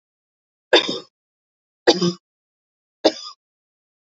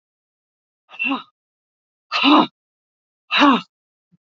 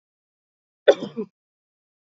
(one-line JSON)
{"three_cough_length": "4.0 s", "three_cough_amplitude": 29390, "three_cough_signal_mean_std_ratio": 0.26, "exhalation_length": "4.4 s", "exhalation_amplitude": 27588, "exhalation_signal_mean_std_ratio": 0.33, "cough_length": "2.0 s", "cough_amplitude": 26577, "cough_signal_mean_std_ratio": 0.18, "survey_phase": "alpha (2021-03-01 to 2021-08-12)", "age": "45-64", "gender": "Female", "wearing_mask": "No", "symptom_none": true, "symptom_onset": "12 days", "smoker_status": "Ex-smoker", "respiratory_condition_asthma": false, "respiratory_condition_other": false, "recruitment_source": "REACT", "submission_delay": "3 days", "covid_test_result": "Negative", "covid_test_method": "RT-qPCR"}